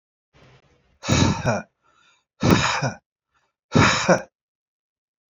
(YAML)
exhalation_length: 5.3 s
exhalation_amplitude: 26975
exhalation_signal_mean_std_ratio: 0.4
survey_phase: alpha (2021-03-01 to 2021-08-12)
age: 45-64
gender: Male
wearing_mask: 'No'
symptom_none: true
smoker_status: Ex-smoker
respiratory_condition_asthma: false
respiratory_condition_other: false
recruitment_source: REACT
submission_delay: 10 days
covid_test_result: Negative
covid_test_method: RT-qPCR